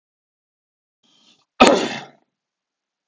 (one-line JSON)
{"cough_length": "3.1 s", "cough_amplitude": 32768, "cough_signal_mean_std_ratio": 0.23, "survey_phase": "alpha (2021-03-01 to 2021-08-12)", "age": "45-64", "gender": "Male", "wearing_mask": "No", "symptom_none": true, "smoker_status": "Never smoked", "respiratory_condition_asthma": false, "respiratory_condition_other": false, "recruitment_source": "REACT", "submission_delay": "1 day", "covid_test_result": "Negative", "covid_test_method": "RT-qPCR"}